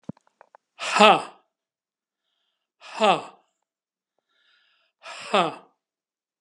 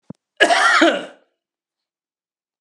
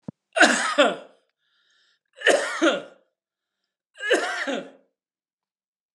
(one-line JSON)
{"exhalation_length": "6.4 s", "exhalation_amplitude": 31892, "exhalation_signal_mean_std_ratio": 0.25, "cough_length": "2.6 s", "cough_amplitude": 32767, "cough_signal_mean_std_ratio": 0.39, "three_cough_length": "5.9 s", "three_cough_amplitude": 27599, "three_cough_signal_mean_std_ratio": 0.38, "survey_phase": "beta (2021-08-13 to 2022-03-07)", "age": "45-64", "gender": "Male", "wearing_mask": "No", "symptom_runny_or_blocked_nose": true, "symptom_fatigue": true, "symptom_onset": "5 days", "smoker_status": "Ex-smoker", "respiratory_condition_asthma": false, "respiratory_condition_other": false, "recruitment_source": "Test and Trace", "submission_delay": "2 days", "covid_test_result": "Negative", "covid_test_method": "ePCR"}